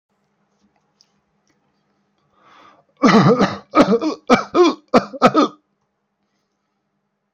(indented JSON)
{
  "cough_length": "7.3 s",
  "cough_amplitude": 29846,
  "cough_signal_mean_std_ratio": 0.36,
  "survey_phase": "alpha (2021-03-01 to 2021-08-12)",
  "age": "18-44",
  "gender": "Male",
  "wearing_mask": "No",
  "symptom_none": true,
  "smoker_status": "Never smoked",
  "respiratory_condition_asthma": false,
  "respiratory_condition_other": false,
  "recruitment_source": "REACT",
  "submission_delay": "0 days",
  "covid_test_result": "Negative",
  "covid_test_method": "RT-qPCR"
}